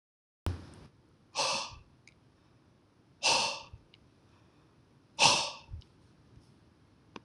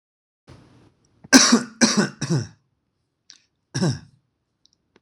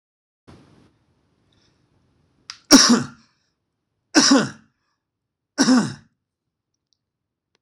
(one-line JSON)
{"exhalation_length": "7.2 s", "exhalation_amplitude": 15623, "exhalation_signal_mean_std_ratio": 0.32, "cough_length": "5.0 s", "cough_amplitude": 26028, "cough_signal_mean_std_ratio": 0.32, "three_cough_length": "7.6 s", "three_cough_amplitude": 26028, "three_cough_signal_mean_std_ratio": 0.27, "survey_phase": "alpha (2021-03-01 to 2021-08-12)", "age": "45-64", "gender": "Male", "wearing_mask": "No", "symptom_none": true, "smoker_status": "Never smoked", "respiratory_condition_asthma": false, "respiratory_condition_other": false, "recruitment_source": "REACT", "submission_delay": "2 days", "covid_test_result": "Negative", "covid_test_method": "RT-qPCR"}